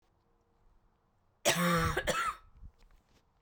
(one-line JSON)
{"cough_length": "3.4 s", "cough_amplitude": 6172, "cough_signal_mean_std_ratio": 0.43, "survey_phase": "beta (2021-08-13 to 2022-03-07)", "age": "18-44", "gender": "Male", "wearing_mask": "No", "symptom_cough_any": true, "symptom_runny_or_blocked_nose": true, "symptom_sore_throat": true, "symptom_abdominal_pain": true, "symptom_fatigue": true, "symptom_headache": true, "symptom_change_to_sense_of_smell_or_taste": true, "symptom_onset": "7 days", "smoker_status": "Ex-smoker", "respiratory_condition_asthma": false, "respiratory_condition_other": false, "recruitment_source": "Test and Trace", "submission_delay": "2 days", "covid_test_result": "Positive", "covid_test_method": "RT-qPCR", "covid_ct_value": 15.7, "covid_ct_gene": "ORF1ab gene"}